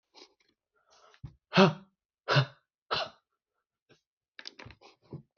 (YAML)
exhalation_length: 5.4 s
exhalation_amplitude: 14929
exhalation_signal_mean_std_ratio: 0.23
survey_phase: beta (2021-08-13 to 2022-03-07)
age: 45-64
gender: Male
wearing_mask: 'No'
symptom_none: true
smoker_status: Ex-smoker
respiratory_condition_asthma: false
respiratory_condition_other: false
recruitment_source: REACT
submission_delay: 3 days
covid_test_result: Negative
covid_test_method: RT-qPCR